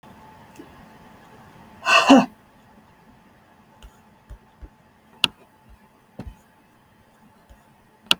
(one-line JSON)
{"exhalation_length": "8.2 s", "exhalation_amplitude": 32768, "exhalation_signal_mean_std_ratio": 0.21, "survey_phase": "beta (2021-08-13 to 2022-03-07)", "age": "45-64", "gender": "Female", "wearing_mask": "No", "symptom_none": true, "smoker_status": "Never smoked", "respiratory_condition_asthma": false, "respiratory_condition_other": false, "recruitment_source": "REACT", "submission_delay": "7 days", "covid_test_result": "Negative", "covid_test_method": "RT-qPCR"}